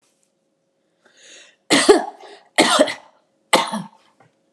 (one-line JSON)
{"three_cough_length": "4.5 s", "three_cough_amplitude": 32767, "three_cough_signal_mean_std_ratio": 0.34, "survey_phase": "alpha (2021-03-01 to 2021-08-12)", "age": "45-64", "gender": "Female", "wearing_mask": "No", "symptom_none": true, "smoker_status": "Never smoked", "respiratory_condition_asthma": false, "respiratory_condition_other": false, "recruitment_source": "REACT", "submission_delay": "1 day", "covid_test_result": "Negative", "covid_test_method": "RT-qPCR"}